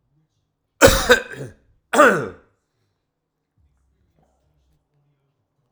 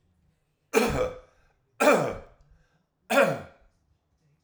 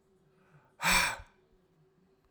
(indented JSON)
{
  "cough_length": "5.7 s",
  "cough_amplitude": 32768,
  "cough_signal_mean_std_ratio": 0.26,
  "three_cough_length": "4.4 s",
  "three_cough_amplitude": 14789,
  "three_cough_signal_mean_std_ratio": 0.38,
  "exhalation_length": "2.3 s",
  "exhalation_amplitude": 6260,
  "exhalation_signal_mean_std_ratio": 0.32,
  "survey_phase": "alpha (2021-03-01 to 2021-08-12)",
  "age": "45-64",
  "gender": "Male",
  "wearing_mask": "No",
  "symptom_cough_any": true,
  "symptom_abdominal_pain": true,
  "symptom_fatigue": true,
  "smoker_status": "Never smoked",
  "respiratory_condition_asthma": false,
  "respiratory_condition_other": false,
  "recruitment_source": "Test and Trace",
  "submission_delay": "1 day",
  "covid_test_result": "Positive",
  "covid_test_method": "RT-qPCR",
  "covid_ct_value": 15.1,
  "covid_ct_gene": "ORF1ab gene",
  "covid_ct_mean": 16.2,
  "covid_viral_load": "4800000 copies/ml",
  "covid_viral_load_category": "High viral load (>1M copies/ml)"
}